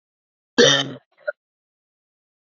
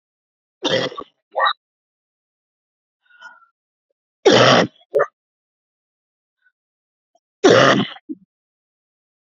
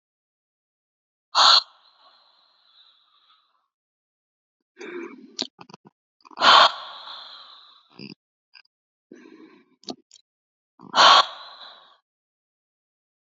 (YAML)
cough_length: 2.6 s
cough_amplitude: 29439
cough_signal_mean_std_ratio: 0.27
three_cough_length: 9.3 s
three_cough_amplitude: 30990
three_cough_signal_mean_std_ratio: 0.3
exhalation_length: 13.3 s
exhalation_amplitude: 32453
exhalation_signal_mean_std_ratio: 0.23
survey_phase: beta (2021-08-13 to 2022-03-07)
age: 18-44
gender: Female
wearing_mask: 'No'
symptom_cough_any: true
symptom_fatigue: true
smoker_status: Never smoked
respiratory_condition_asthma: true
respiratory_condition_other: true
recruitment_source: REACT
submission_delay: 1 day
covid_test_result: Negative
covid_test_method: RT-qPCR
influenza_a_test_result: Negative
influenza_b_test_result: Negative